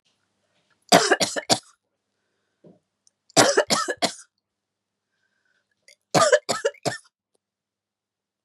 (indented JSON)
{
  "three_cough_length": "8.4 s",
  "three_cough_amplitude": 32380,
  "three_cough_signal_mean_std_ratio": 0.3,
  "survey_phase": "beta (2021-08-13 to 2022-03-07)",
  "age": "45-64",
  "gender": "Female",
  "wearing_mask": "No",
  "symptom_none": true,
  "symptom_onset": "12 days",
  "smoker_status": "Never smoked",
  "respiratory_condition_asthma": false,
  "respiratory_condition_other": false,
  "recruitment_source": "REACT",
  "submission_delay": "1 day",
  "covid_test_result": "Negative",
  "covid_test_method": "RT-qPCR",
  "influenza_a_test_result": "Unknown/Void",
  "influenza_b_test_result": "Unknown/Void"
}